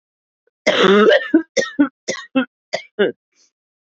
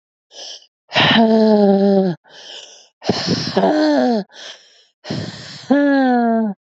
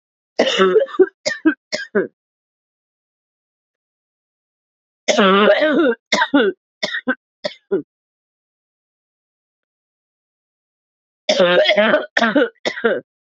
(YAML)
cough_length: 3.8 s
cough_amplitude: 27392
cough_signal_mean_std_ratio: 0.46
exhalation_length: 6.7 s
exhalation_amplitude: 27491
exhalation_signal_mean_std_ratio: 0.68
three_cough_length: 13.4 s
three_cough_amplitude: 29495
three_cough_signal_mean_std_ratio: 0.43
survey_phase: beta (2021-08-13 to 2022-03-07)
age: 18-44
gender: Female
wearing_mask: 'No'
symptom_cough_any: true
symptom_runny_or_blocked_nose: true
symptom_sore_throat: true
symptom_fatigue: true
symptom_headache: true
symptom_other: true
symptom_onset: 2 days
smoker_status: Never smoked
respiratory_condition_asthma: false
respiratory_condition_other: false
recruitment_source: Test and Trace
submission_delay: 2 days
covid_test_result: Positive
covid_test_method: RT-qPCR
covid_ct_value: 25.6
covid_ct_gene: ORF1ab gene
covid_ct_mean: 26.0
covid_viral_load: 3000 copies/ml
covid_viral_load_category: Minimal viral load (< 10K copies/ml)